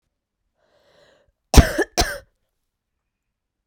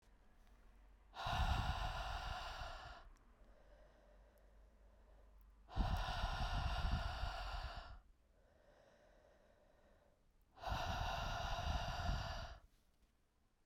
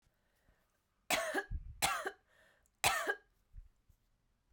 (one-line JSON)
{"cough_length": "3.7 s", "cough_amplitude": 32768, "cough_signal_mean_std_ratio": 0.2, "exhalation_length": "13.7 s", "exhalation_amplitude": 1743, "exhalation_signal_mean_std_ratio": 0.61, "three_cough_length": "4.5 s", "three_cough_amplitude": 6291, "three_cough_signal_mean_std_ratio": 0.39, "survey_phase": "beta (2021-08-13 to 2022-03-07)", "age": "18-44", "gender": "Female", "wearing_mask": "No", "symptom_cough_any": true, "symptom_runny_or_blocked_nose": true, "symptom_sore_throat": true, "symptom_abdominal_pain": true, "symptom_fatigue": true, "symptom_headache": true, "symptom_change_to_sense_of_smell_or_taste": true, "symptom_loss_of_taste": true, "symptom_onset": "3 days", "smoker_status": "Ex-smoker", "respiratory_condition_asthma": true, "respiratory_condition_other": false, "recruitment_source": "Test and Trace", "submission_delay": "2 days", "covid_test_result": "Positive", "covid_test_method": "RT-qPCR", "covid_ct_value": 22.9, "covid_ct_gene": "ORF1ab gene"}